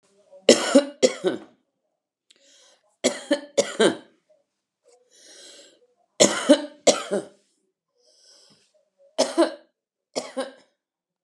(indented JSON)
{
  "cough_length": "11.2 s",
  "cough_amplitude": 31354,
  "cough_signal_mean_std_ratio": 0.29,
  "survey_phase": "beta (2021-08-13 to 2022-03-07)",
  "age": "65+",
  "gender": "Female",
  "wearing_mask": "Yes",
  "symptom_headache": true,
  "smoker_status": "Ex-smoker",
  "respiratory_condition_asthma": false,
  "respiratory_condition_other": false,
  "recruitment_source": "REACT",
  "submission_delay": "19 days",
  "covid_test_result": "Negative",
  "covid_test_method": "RT-qPCR",
  "influenza_a_test_result": "Negative",
  "influenza_b_test_result": "Negative"
}